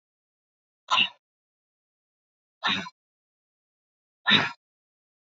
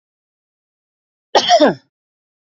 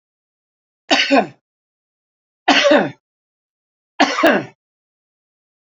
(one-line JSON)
{"exhalation_length": "5.4 s", "exhalation_amplitude": 16101, "exhalation_signal_mean_std_ratio": 0.25, "cough_length": "2.5 s", "cough_amplitude": 32768, "cough_signal_mean_std_ratio": 0.3, "three_cough_length": "5.6 s", "three_cough_amplitude": 31040, "three_cough_signal_mean_std_ratio": 0.35, "survey_phase": "beta (2021-08-13 to 2022-03-07)", "age": "65+", "gender": "Male", "wearing_mask": "No", "symptom_none": true, "smoker_status": "Never smoked", "respiratory_condition_asthma": false, "respiratory_condition_other": false, "recruitment_source": "REACT", "submission_delay": "1 day", "covid_test_result": "Negative", "covid_test_method": "RT-qPCR", "influenza_a_test_result": "Positive", "influenza_a_ct_value": 34.3, "influenza_b_test_result": "Negative"}